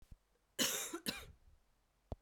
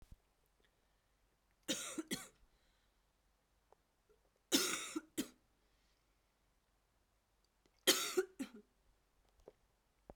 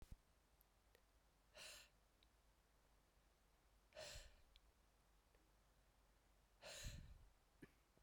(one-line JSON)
{"cough_length": "2.2 s", "cough_amplitude": 2948, "cough_signal_mean_std_ratio": 0.4, "three_cough_length": "10.2 s", "three_cough_amplitude": 5124, "three_cough_signal_mean_std_ratio": 0.26, "exhalation_length": "8.0 s", "exhalation_amplitude": 267, "exhalation_signal_mean_std_ratio": 0.53, "survey_phase": "beta (2021-08-13 to 2022-03-07)", "age": "45-64", "gender": "Female", "wearing_mask": "Yes", "symptom_cough_any": true, "symptom_new_continuous_cough": true, "symptom_runny_or_blocked_nose": true, "symptom_fatigue": true, "symptom_fever_high_temperature": true, "symptom_headache": true, "symptom_change_to_sense_of_smell_or_taste": true, "symptom_loss_of_taste": true, "symptom_other": true, "symptom_onset": "5 days", "smoker_status": "Never smoked", "respiratory_condition_asthma": false, "respiratory_condition_other": false, "recruitment_source": "Test and Trace", "submission_delay": "2 days", "covid_test_result": "Positive", "covid_test_method": "RT-qPCR"}